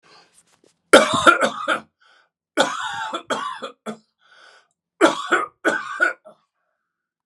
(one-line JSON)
{"three_cough_length": "7.3 s", "three_cough_amplitude": 32768, "three_cough_signal_mean_std_ratio": 0.38, "survey_phase": "beta (2021-08-13 to 2022-03-07)", "age": "65+", "gender": "Male", "wearing_mask": "No", "symptom_none": true, "smoker_status": "Ex-smoker", "respiratory_condition_asthma": false, "respiratory_condition_other": false, "recruitment_source": "REACT", "submission_delay": "6 days", "covid_test_result": "Negative", "covid_test_method": "RT-qPCR"}